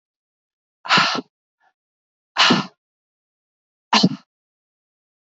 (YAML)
exhalation_length: 5.4 s
exhalation_amplitude: 25841
exhalation_signal_mean_std_ratio: 0.29
survey_phase: beta (2021-08-13 to 2022-03-07)
age: 18-44
gender: Female
wearing_mask: 'No'
symptom_none: true
smoker_status: Never smoked
respiratory_condition_asthma: true
respiratory_condition_other: false
recruitment_source: REACT
submission_delay: 1 day
covid_test_result: Negative
covid_test_method: RT-qPCR
influenza_a_test_result: Negative
influenza_b_test_result: Negative